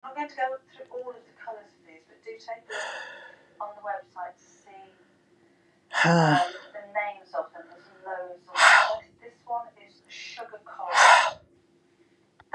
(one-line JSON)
{"exhalation_length": "12.5 s", "exhalation_amplitude": 26380, "exhalation_signal_mean_std_ratio": 0.37, "survey_phase": "beta (2021-08-13 to 2022-03-07)", "age": "45-64", "gender": "Female", "wearing_mask": "No", "symptom_none": true, "smoker_status": "Ex-smoker", "respiratory_condition_asthma": false, "respiratory_condition_other": false, "recruitment_source": "REACT", "submission_delay": "2 days", "covid_test_result": "Negative", "covid_test_method": "RT-qPCR", "influenza_a_test_result": "Negative", "influenza_b_test_result": "Negative"}